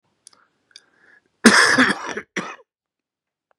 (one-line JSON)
{"cough_length": "3.6 s", "cough_amplitude": 32768, "cough_signal_mean_std_ratio": 0.32, "survey_phase": "beta (2021-08-13 to 2022-03-07)", "age": "45-64", "gender": "Male", "wearing_mask": "No", "symptom_cough_any": true, "symptom_runny_or_blocked_nose": true, "symptom_sore_throat": true, "symptom_fever_high_temperature": true, "symptom_headache": true, "symptom_onset": "3 days", "smoker_status": "Never smoked", "respiratory_condition_asthma": false, "respiratory_condition_other": false, "recruitment_source": "Test and Trace", "submission_delay": "1 day", "covid_test_result": "Negative", "covid_test_method": "ePCR"}